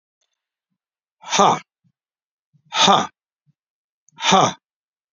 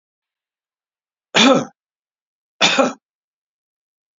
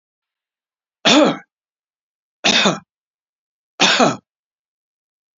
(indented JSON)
{
  "exhalation_length": "5.1 s",
  "exhalation_amplitude": 32768,
  "exhalation_signal_mean_std_ratio": 0.31,
  "cough_length": "4.2 s",
  "cough_amplitude": 31239,
  "cough_signal_mean_std_ratio": 0.29,
  "three_cough_length": "5.4 s",
  "three_cough_amplitude": 31013,
  "three_cough_signal_mean_std_ratio": 0.33,
  "survey_phase": "beta (2021-08-13 to 2022-03-07)",
  "age": "65+",
  "gender": "Male",
  "wearing_mask": "No",
  "symptom_cough_any": true,
  "symptom_sore_throat": true,
  "symptom_headache": true,
  "symptom_onset": "4 days",
  "smoker_status": "Ex-smoker",
  "respiratory_condition_asthma": false,
  "respiratory_condition_other": false,
  "recruitment_source": "Test and Trace",
  "submission_delay": "2 days",
  "covid_test_result": "Positive",
  "covid_test_method": "RT-qPCR",
  "covid_ct_value": 21.7,
  "covid_ct_gene": "ORF1ab gene",
  "covid_ct_mean": 22.2,
  "covid_viral_load": "53000 copies/ml",
  "covid_viral_load_category": "Low viral load (10K-1M copies/ml)"
}